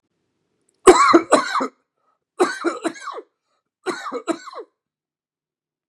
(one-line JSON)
{"three_cough_length": "5.9 s", "three_cough_amplitude": 32768, "three_cough_signal_mean_std_ratio": 0.32, "survey_phase": "beta (2021-08-13 to 2022-03-07)", "age": "45-64", "gender": "Male", "wearing_mask": "No", "symptom_none": true, "smoker_status": "Ex-smoker", "respiratory_condition_asthma": false, "respiratory_condition_other": true, "recruitment_source": "REACT", "submission_delay": "2 days", "covid_test_result": "Negative", "covid_test_method": "RT-qPCR", "influenza_a_test_result": "Negative", "influenza_b_test_result": "Negative"}